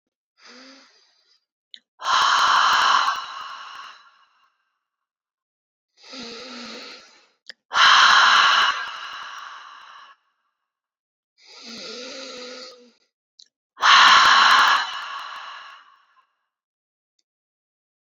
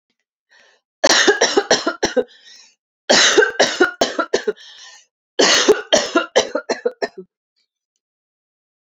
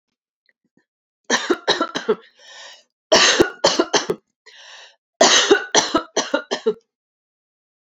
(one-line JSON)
{"exhalation_length": "18.2 s", "exhalation_amplitude": 28089, "exhalation_signal_mean_std_ratio": 0.39, "cough_length": "8.9 s", "cough_amplitude": 32767, "cough_signal_mean_std_ratio": 0.45, "three_cough_length": "7.9 s", "three_cough_amplitude": 32768, "three_cough_signal_mean_std_ratio": 0.41, "survey_phase": "alpha (2021-03-01 to 2021-08-12)", "age": "18-44", "gender": "Female", "wearing_mask": "No", "symptom_diarrhoea": true, "symptom_fatigue": true, "symptom_change_to_sense_of_smell_or_taste": true, "smoker_status": "Never smoked", "respiratory_condition_asthma": false, "respiratory_condition_other": false, "recruitment_source": "Test and Trace", "submission_delay": "2 days", "covid_test_result": "Positive", "covid_test_method": "RT-qPCR"}